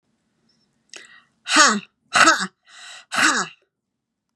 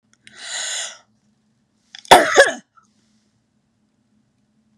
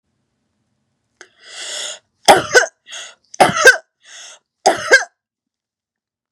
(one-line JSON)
{"exhalation_length": "4.4 s", "exhalation_amplitude": 31504, "exhalation_signal_mean_std_ratio": 0.36, "cough_length": "4.8 s", "cough_amplitude": 32768, "cough_signal_mean_std_ratio": 0.24, "three_cough_length": "6.3 s", "three_cough_amplitude": 32768, "three_cough_signal_mean_std_ratio": 0.3, "survey_phase": "beta (2021-08-13 to 2022-03-07)", "age": "45-64", "gender": "Female", "wearing_mask": "No", "symptom_change_to_sense_of_smell_or_taste": true, "symptom_onset": "4 days", "smoker_status": "Never smoked", "respiratory_condition_asthma": false, "respiratory_condition_other": false, "recruitment_source": "REACT", "submission_delay": "1 day", "covid_test_result": "Negative", "covid_test_method": "RT-qPCR", "influenza_a_test_result": "Negative", "influenza_b_test_result": "Negative"}